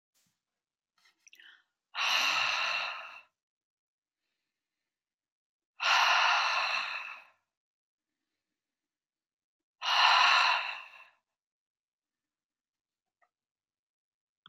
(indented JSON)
{
  "exhalation_length": "14.5 s",
  "exhalation_amplitude": 9044,
  "exhalation_signal_mean_std_ratio": 0.37,
  "survey_phase": "beta (2021-08-13 to 2022-03-07)",
  "age": "65+",
  "gender": "Female",
  "wearing_mask": "No",
  "symptom_runny_or_blocked_nose": true,
  "symptom_onset": "12 days",
  "smoker_status": "Never smoked",
  "respiratory_condition_asthma": false,
  "respiratory_condition_other": false,
  "recruitment_source": "REACT",
  "submission_delay": "1 day",
  "covid_test_result": "Negative",
  "covid_test_method": "RT-qPCR",
  "influenza_a_test_result": "Negative",
  "influenza_b_test_result": "Negative"
}